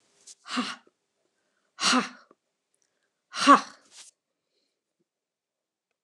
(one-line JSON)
{"exhalation_length": "6.0 s", "exhalation_amplitude": 23954, "exhalation_signal_mean_std_ratio": 0.22, "survey_phase": "beta (2021-08-13 to 2022-03-07)", "age": "65+", "gender": "Female", "wearing_mask": "No", "symptom_cough_any": true, "symptom_runny_or_blocked_nose": true, "symptom_fatigue": true, "symptom_headache": true, "symptom_loss_of_taste": true, "symptom_onset": "4 days", "smoker_status": "Never smoked", "respiratory_condition_asthma": false, "respiratory_condition_other": false, "recruitment_source": "Test and Trace", "submission_delay": "2 days", "covid_test_result": "Positive", "covid_test_method": "RT-qPCR", "covid_ct_value": 20.3, "covid_ct_gene": "ORF1ab gene", "covid_ct_mean": 20.4, "covid_viral_load": "210000 copies/ml", "covid_viral_load_category": "Low viral load (10K-1M copies/ml)"}